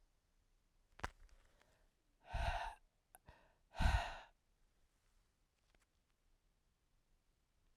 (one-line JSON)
{"exhalation_length": "7.8 s", "exhalation_amplitude": 2549, "exhalation_signal_mean_std_ratio": 0.26, "survey_phase": "beta (2021-08-13 to 2022-03-07)", "age": "45-64", "gender": "Female", "wearing_mask": "No", "symptom_cough_any": true, "symptom_runny_or_blocked_nose": true, "symptom_shortness_of_breath": true, "symptom_sore_throat": true, "symptom_fatigue": true, "symptom_fever_high_temperature": true, "symptom_headache": true, "symptom_onset": "3 days", "smoker_status": "Never smoked", "respiratory_condition_asthma": false, "respiratory_condition_other": false, "recruitment_source": "Test and Trace", "submission_delay": "2 days", "covid_test_result": "Positive", "covid_test_method": "RT-qPCR", "covid_ct_value": 22.7, "covid_ct_gene": "ORF1ab gene"}